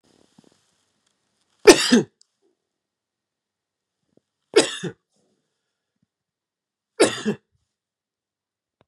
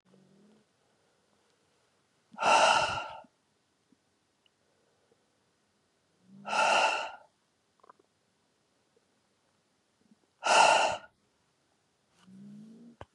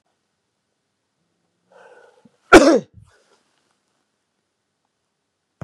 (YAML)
three_cough_length: 8.9 s
three_cough_amplitude: 32768
three_cough_signal_mean_std_ratio: 0.19
exhalation_length: 13.1 s
exhalation_amplitude: 11345
exhalation_signal_mean_std_ratio: 0.3
cough_length: 5.6 s
cough_amplitude: 32768
cough_signal_mean_std_ratio: 0.17
survey_phase: beta (2021-08-13 to 2022-03-07)
age: 45-64
gender: Male
wearing_mask: 'No'
symptom_headache: true
symptom_onset: 2 days
smoker_status: Never smoked
respiratory_condition_asthma: false
respiratory_condition_other: false
recruitment_source: Test and Trace
submission_delay: 1 day
covid_test_result: Negative
covid_test_method: RT-qPCR